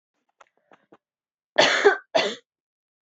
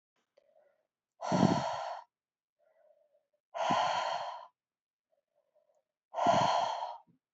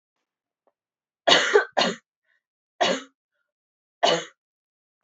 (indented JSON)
{
  "cough_length": "3.1 s",
  "cough_amplitude": 23796,
  "cough_signal_mean_std_ratio": 0.32,
  "exhalation_length": "7.3 s",
  "exhalation_amplitude": 8222,
  "exhalation_signal_mean_std_ratio": 0.44,
  "three_cough_length": "5.0 s",
  "three_cough_amplitude": 22178,
  "three_cough_signal_mean_std_ratio": 0.32,
  "survey_phase": "beta (2021-08-13 to 2022-03-07)",
  "age": "18-44",
  "gender": "Female",
  "wearing_mask": "No",
  "symptom_cough_any": true,
  "symptom_runny_or_blocked_nose": true,
  "symptom_shortness_of_breath": true,
  "symptom_fatigue": true,
  "symptom_onset": "3 days",
  "smoker_status": "Prefer not to say",
  "respiratory_condition_asthma": false,
  "respiratory_condition_other": false,
  "recruitment_source": "Test and Trace",
  "submission_delay": "1 day",
  "covid_test_result": "Positive",
  "covid_test_method": "ePCR"
}